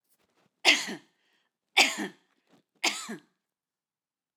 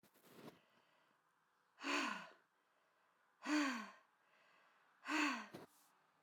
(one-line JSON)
{"three_cough_length": "4.4 s", "three_cough_amplitude": 20729, "three_cough_signal_mean_std_ratio": 0.27, "exhalation_length": "6.2 s", "exhalation_amplitude": 1445, "exhalation_signal_mean_std_ratio": 0.39, "survey_phase": "alpha (2021-03-01 to 2021-08-12)", "age": "45-64", "gender": "Female", "wearing_mask": "No", "symptom_none": true, "smoker_status": "Never smoked", "respiratory_condition_asthma": false, "respiratory_condition_other": false, "recruitment_source": "REACT", "submission_delay": "2 days", "covid_test_result": "Negative", "covid_test_method": "RT-qPCR"}